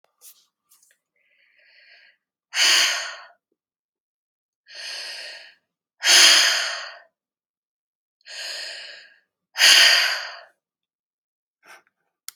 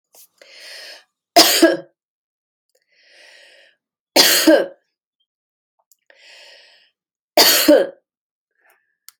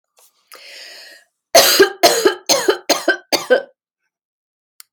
{"exhalation_length": "12.4 s", "exhalation_amplitude": 28865, "exhalation_signal_mean_std_ratio": 0.33, "three_cough_length": "9.2 s", "three_cough_amplitude": 32768, "three_cough_signal_mean_std_ratio": 0.31, "cough_length": "4.9 s", "cough_amplitude": 32767, "cough_signal_mean_std_ratio": 0.41, "survey_phase": "beta (2021-08-13 to 2022-03-07)", "age": "45-64", "gender": "Female", "wearing_mask": "No", "symptom_none": true, "smoker_status": "Ex-smoker", "respiratory_condition_asthma": false, "respiratory_condition_other": false, "recruitment_source": "REACT", "submission_delay": "1 day", "covid_test_result": "Negative", "covid_test_method": "RT-qPCR"}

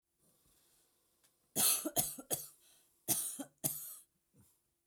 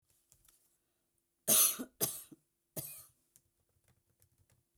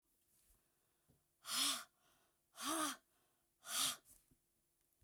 {"cough_length": "4.9 s", "cough_amplitude": 5967, "cough_signal_mean_std_ratio": 0.37, "three_cough_length": "4.8 s", "three_cough_amplitude": 6374, "three_cough_signal_mean_std_ratio": 0.25, "exhalation_length": "5.0 s", "exhalation_amplitude": 1572, "exhalation_signal_mean_std_ratio": 0.37, "survey_phase": "beta (2021-08-13 to 2022-03-07)", "age": "45-64", "gender": "Female", "wearing_mask": "No", "symptom_none": true, "smoker_status": "Never smoked", "respiratory_condition_asthma": false, "respiratory_condition_other": false, "recruitment_source": "REACT", "submission_delay": "1 day", "covid_test_result": "Negative", "covid_test_method": "RT-qPCR"}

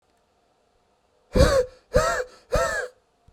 {"exhalation_length": "3.3 s", "exhalation_amplitude": 20926, "exhalation_signal_mean_std_ratio": 0.42, "survey_phase": "beta (2021-08-13 to 2022-03-07)", "age": "18-44", "gender": "Male", "wearing_mask": "No", "symptom_none": true, "smoker_status": "Current smoker (e-cigarettes or vapes only)", "respiratory_condition_asthma": false, "respiratory_condition_other": false, "recruitment_source": "REACT", "submission_delay": "2 days", "covid_test_result": "Negative", "covid_test_method": "RT-qPCR", "influenza_a_test_result": "Negative", "influenza_b_test_result": "Negative"}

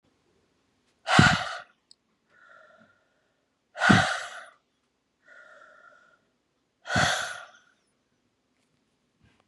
{"exhalation_length": "9.5 s", "exhalation_amplitude": 22061, "exhalation_signal_mean_std_ratio": 0.27, "survey_phase": "beta (2021-08-13 to 2022-03-07)", "age": "45-64", "gender": "Female", "wearing_mask": "No", "symptom_cough_any": true, "symptom_runny_or_blocked_nose": true, "symptom_sore_throat": true, "symptom_fatigue": true, "symptom_fever_high_temperature": true, "symptom_headache": true, "symptom_change_to_sense_of_smell_or_taste": true, "symptom_other": true, "symptom_onset": "4 days", "smoker_status": "Never smoked", "respiratory_condition_asthma": false, "respiratory_condition_other": false, "recruitment_source": "Test and Trace", "submission_delay": "2 days", "covid_test_result": "Positive", "covid_test_method": "RT-qPCR", "covid_ct_value": 25.3, "covid_ct_gene": "N gene"}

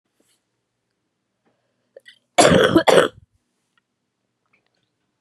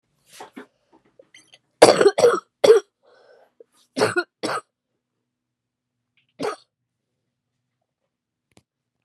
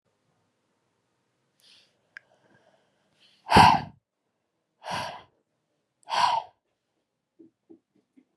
{"cough_length": "5.2 s", "cough_amplitude": 32766, "cough_signal_mean_std_ratio": 0.27, "three_cough_length": "9.0 s", "three_cough_amplitude": 32768, "three_cough_signal_mean_std_ratio": 0.24, "exhalation_length": "8.4 s", "exhalation_amplitude": 22095, "exhalation_signal_mean_std_ratio": 0.22, "survey_phase": "beta (2021-08-13 to 2022-03-07)", "age": "18-44", "gender": "Female", "wearing_mask": "No", "symptom_new_continuous_cough": true, "symptom_runny_or_blocked_nose": true, "symptom_fatigue": true, "symptom_change_to_sense_of_smell_or_taste": true, "symptom_onset": "3 days", "smoker_status": "Ex-smoker", "respiratory_condition_asthma": false, "respiratory_condition_other": false, "recruitment_source": "Test and Trace", "submission_delay": "2 days", "covid_test_result": "Positive", "covid_test_method": "RT-qPCR", "covid_ct_value": 27.4, "covid_ct_gene": "N gene", "covid_ct_mean": 28.8, "covid_viral_load": "360 copies/ml", "covid_viral_load_category": "Minimal viral load (< 10K copies/ml)"}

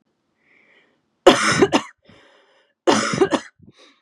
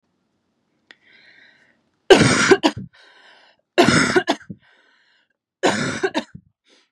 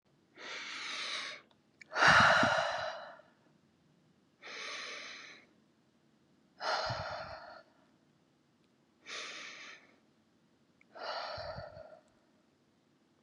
{"cough_length": "4.0 s", "cough_amplitude": 32768, "cough_signal_mean_std_ratio": 0.36, "three_cough_length": "6.9 s", "three_cough_amplitude": 32767, "three_cough_signal_mean_std_ratio": 0.35, "exhalation_length": "13.2 s", "exhalation_amplitude": 9960, "exhalation_signal_mean_std_ratio": 0.36, "survey_phase": "beta (2021-08-13 to 2022-03-07)", "age": "18-44", "gender": "Female", "wearing_mask": "No", "symptom_cough_any": true, "symptom_runny_or_blocked_nose": true, "symptom_onset": "5 days", "smoker_status": "Never smoked", "respiratory_condition_asthma": false, "respiratory_condition_other": false, "recruitment_source": "REACT", "submission_delay": "2 days", "covid_test_result": "Negative", "covid_test_method": "RT-qPCR", "influenza_a_test_result": "Negative", "influenza_b_test_result": "Negative"}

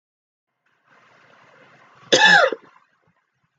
{"cough_length": "3.6 s", "cough_amplitude": 30515, "cough_signal_mean_std_ratio": 0.28, "survey_phase": "beta (2021-08-13 to 2022-03-07)", "age": "18-44", "gender": "Female", "wearing_mask": "No", "symptom_cough_any": true, "symptom_runny_or_blocked_nose": true, "symptom_sore_throat": true, "symptom_fatigue": true, "symptom_onset": "4 days", "smoker_status": "Never smoked", "respiratory_condition_asthma": true, "respiratory_condition_other": false, "recruitment_source": "Test and Trace", "submission_delay": "2 days", "covid_test_result": "Positive", "covid_test_method": "RT-qPCR", "covid_ct_value": 20.6, "covid_ct_gene": "ORF1ab gene", "covid_ct_mean": 20.7, "covid_viral_load": "160000 copies/ml", "covid_viral_load_category": "Low viral load (10K-1M copies/ml)"}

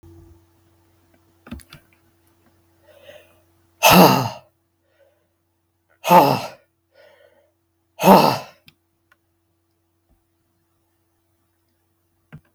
{"exhalation_length": "12.5 s", "exhalation_amplitude": 32768, "exhalation_signal_mean_std_ratio": 0.24, "survey_phase": "beta (2021-08-13 to 2022-03-07)", "age": "65+", "gender": "Male", "wearing_mask": "No", "symptom_none": true, "smoker_status": "Never smoked", "respiratory_condition_asthma": false, "respiratory_condition_other": false, "recruitment_source": "REACT", "submission_delay": "3 days", "covid_test_result": "Negative", "covid_test_method": "RT-qPCR", "influenza_a_test_result": "Negative", "influenza_b_test_result": "Negative"}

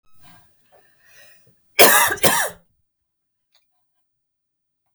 {"cough_length": "4.9 s", "cough_amplitude": 32768, "cough_signal_mean_std_ratio": 0.27, "survey_phase": "beta (2021-08-13 to 2022-03-07)", "age": "45-64", "gender": "Female", "wearing_mask": "No", "symptom_cough_any": true, "symptom_fatigue": true, "symptom_headache": true, "symptom_other": true, "symptom_onset": "6 days", "smoker_status": "Never smoked", "respiratory_condition_asthma": false, "respiratory_condition_other": false, "recruitment_source": "REACT", "submission_delay": "1 day", "covid_test_result": "Negative", "covid_test_method": "RT-qPCR", "influenza_a_test_result": "Negative", "influenza_b_test_result": "Negative"}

